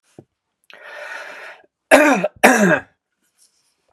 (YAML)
cough_length: 3.9 s
cough_amplitude: 32768
cough_signal_mean_std_ratio: 0.36
survey_phase: beta (2021-08-13 to 2022-03-07)
age: 45-64
gender: Male
wearing_mask: 'No'
symptom_none: true
smoker_status: Never smoked
respiratory_condition_asthma: false
respiratory_condition_other: false
recruitment_source: REACT
submission_delay: 0 days
covid_test_result: Negative
covid_test_method: RT-qPCR
influenza_a_test_result: Negative
influenza_b_test_result: Negative